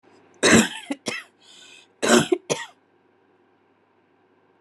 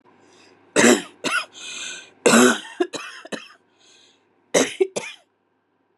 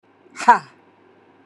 {"cough_length": "4.6 s", "cough_amplitude": 25765, "cough_signal_mean_std_ratio": 0.32, "three_cough_length": "6.0 s", "three_cough_amplitude": 31234, "three_cough_signal_mean_std_ratio": 0.37, "exhalation_length": "1.5 s", "exhalation_amplitude": 32766, "exhalation_signal_mean_std_ratio": 0.24, "survey_phase": "beta (2021-08-13 to 2022-03-07)", "age": "45-64", "gender": "Female", "wearing_mask": "No", "symptom_runny_or_blocked_nose": true, "symptom_sore_throat": true, "symptom_fever_high_temperature": true, "symptom_headache": true, "symptom_change_to_sense_of_smell_or_taste": true, "symptom_other": true, "smoker_status": "Never smoked", "respiratory_condition_asthma": false, "respiratory_condition_other": false, "recruitment_source": "Test and Trace", "submission_delay": "2 days", "covid_test_result": "Positive", "covid_test_method": "RT-qPCR", "covid_ct_value": 31.8, "covid_ct_gene": "ORF1ab gene"}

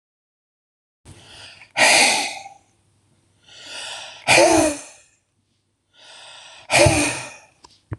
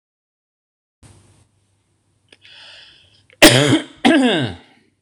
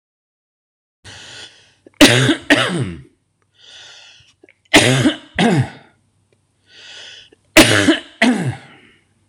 {"exhalation_length": "8.0 s", "exhalation_amplitude": 26014, "exhalation_signal_mean_std_ratio": 0.38, "cough_length": "5.0 s", "cough_amplitude": 26028, "cough_signal_mean_std_ratio": 0.32, "three_cough_length": "9.3 s", "three_cough_amplitude": 26028, "three_cough_signal_mean_std_ratio": 0.39, "survey_phase": "beta (2021-08-13 to 2022-03-07)", "age": "45-64", "gender": "Male", "wearing_mask": "No", "symptom_none": true, "smoker_status": "Never smoked", "respiratory_condition_asthma": false, "respiratory_condition_other": false, "recruitment_source": "REACT", "submission_delay": "1 day", "covid_test_result": "Negative", "covid_test_method": "RT-qPCR"}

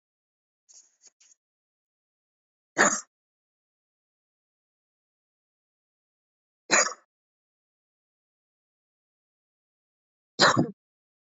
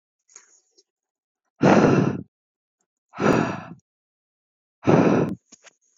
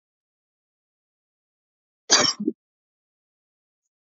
{"three_cough_length": "11.3 s", "three_cough_amplitude": 18216, "three_cough_signal_mean_std_ratio": 0.18, "exhalation_length": "6.0 s", "exhalation_amplitude": 22619, "exhalation_signal_mean_std_ratio": 0.38, "cough_length": "4.2 s", "cough_amplitude": 27820, "cough_signal_mean_std_ratio": 0.2, "survey_phase": "beta (2021-08-13 to 2022-03-07)", "age": "18-44", "gender": "Female", "wearing_mask": "No", "symptom_none": true, "smoker_status": "Never smoked", "respiratory_condition_asthma": false, "respiratory_condition_other": false, "recruitment_source": "REACT", "submission_delay": "3 days", "covid_test_result": "Negative", "covid_test_method": "RT-qPCR", "influenza_a_test_result": "Negative", "influenza_b_test_result": "Negative"}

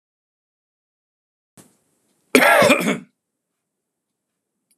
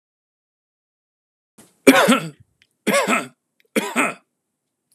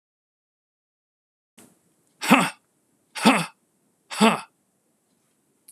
{"cough_length": "4.8 s", "cough_amplitude": 32768, "cough_signal_mean_std_ratio": 0.28, "three_cough_length": "4.9 s", "three_cough_amplitude": 32768, "three_cough_signal_mean_std_ratio": 0.33, "exhalation_length": "5.7 s", "exhalation_amplitude": 30156, "exhalation_signal_mean_std_ratio": 0.26, "survey_phase": "alpha (2021-03-01 to 2021-08-12)", "age": "45-64", "gender": "Male", "wearing_mask": "No", "symptom_none": true, "smoker_status": "Ex-smoker", "respiratory_condition_asthma": true, "respiratory_condition_other": false, "recruitment_source": "REACT", "submission_delay": "1 day", "covid_test_result": "Negative", "covid_test_method": "RT-qPCR"}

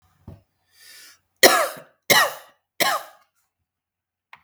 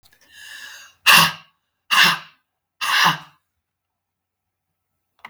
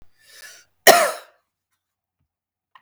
{"three_cough_length": "4.4 s", "three_cough_amplitude": 32766, "three_cough_signal_mean_std_ratio": 0.29, "exhalation_length": "5.3 s", "exhalation_amplitude": 32768, "exhalation_signal_mean_std_ratio": 0.32, "cough_length": "2.8 s", "cough_amplitude": 32768, "cough_signal_mean_std_ratio": 0.23, "survey_phase": "beta (2021-08-13 to 2022-03-07)", "age": "45-64", "gender": "Female", "wearing_mask": "No", "symptom_cough_any": true, "symptom_shortness_of_breath": true, "symptom_onset": "12 days", "smoker_status": "Ex-smoker", "respiratory_condition_asthma": false, "respiratory_condition_other": false, "recruitment_source": "REACT", "submission_delay": "4 days", "covid_test_result": "Negative", "covid_test_method": "RT-qPCR", "influenza_a_test_result": "Negative", "influenza_b_test_result": "Negative"}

